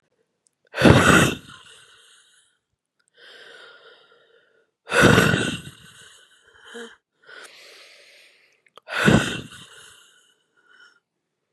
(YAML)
exhalation_length: 11.5 s
exhalation_amplitude: 32158
exhalation_signal_mean_std_ratio: 0.3
survey_phase: beta (2021-08-13 to 2022-03-07)
age: 18-44
gender: Female
wearing_mask: 'No'
symptom_cough_any: true
symptom_runny_or_blocked_nose: true
symptom_abdominal_pain: true
symptom_fever_high_temperature: true
symptom_headache: true
smoker_status: Ex-smoker
respiratory_condition_asthma: false
respiratory_condition_other: false
recruitment_source: Test and Trace
submission_delay: 2 days
covid_test_result: Positive
covid_test_method: RT-qPCR
covid_ct_value: 15.8
covid_ct_gene: ORF1ab gene
covid_ct_mean: 18.1
covid_viral_load: 1200000 copies/ml
covid_viral_load_category: High viral load (>1M copies/ml)